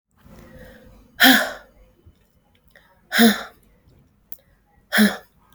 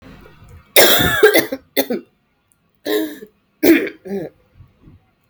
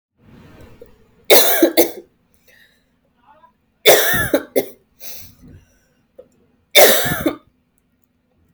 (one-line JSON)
{"exhalation_length": "5.5 s", "exhalation_amplitude": 32510, "exhalation_signal_mean_std_ratio": 0.3, "cough_length": "5.3 s", "cough_amplitude": 32768, "cough_signal_mean_std_ratio": 0.42, "three_cough_length": "8.5 s", "three_cough_amplitude": 32768, "three_cough_signal_mean_std_ratio": 0.35, "survey_phase": "beta (2021-08-13 to 2022-03-07)", "age": "18-44", "gender": "Female", "wearing_mask": "No", "symptom_cough_any": true, "symptom_new_continuous_cough": true, "symptom_runny_or_blocked_nose": true, "symptom_shortness_of_breath": true, "symptom_sore_throat": true, "symptom_fatigue": true, "symptom_fever_high_temperature": true, "symptom_headache": true, "symptom_onset": "4 days", "smoker_status": "Never smoked", "respiratory_condition_asthma": false, "respiratory_condition_other": false, "recruitment_source": "Test and Trace", "submission_delay": "2 days", "covid_test_result": "Positive", "covid_test_method": "RT-qPCR", "covid_ct_value": 24.7, "covid_ct_gene": "ORF1ab gene", "covid_ct_mean": 25.9, "covid_viral_load": "3300 copies/ml", "covid_viral_load_category": "Minimal viral load (< 10K copies/ml)"}